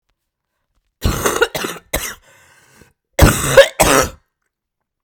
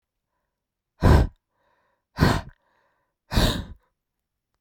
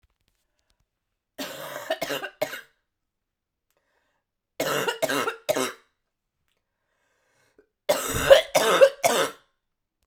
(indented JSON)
{
  "cough_length": "5.0 s",
  "cough_amplitude": 32768,
  "cough_signal_mean_std_ratio": 0.37,
  "exhalation_length": "4.6 s",
  "exhalation_amplitude": 21332,
  "exhalation_signal_mean_std_ratio": 0.31,
  "three_cough_length": "10.1 s",
  "three_cough_amplitude": 31831,
  "three_cough_signal_mean_std_ratio": 0.33,
  "survey_phase": "beta (2021-08-13 to 2022-03-07)",
  "age": "18-44",
  "gender": "Female",
  "wearing_mask": "No",
  "symptom_cough_any": true,
  "symptom_new_continuous_cough": true,
  "symptom_runny_or_blocked_nose": true,
  "symptom_sore_throat": true,
  "symptom_diarrhoea": true,
  "symptom_fever_high_temperature": true,
  "symptom_headache": true,
  "symptom_change_to_sense_of_smell_or_taste": true,
  "symptom_loss_of_taste": true,
  "symptom_onset": "3 days",
  "smoker_status": "Ex-smoker",
  "respiratory_condition_asthma": false,
  "respiratory_condition_other": false,
  "recruitment_source": "Test and Trace",
  "submission_delay": "2 days",
  "covid_test_result": "Positive",
  "covid_test_method": "RT-qPCR",
  "covid_ct_value": 10.7,
  "covid_ct_gene": "ORF1ab gene",
  "covid_ct_mean": 11.2,
  "covid_viral_load": "210000000 copies/ml",
  "covid_viral_load_category": "High viral load (>1M copies/ml)"
}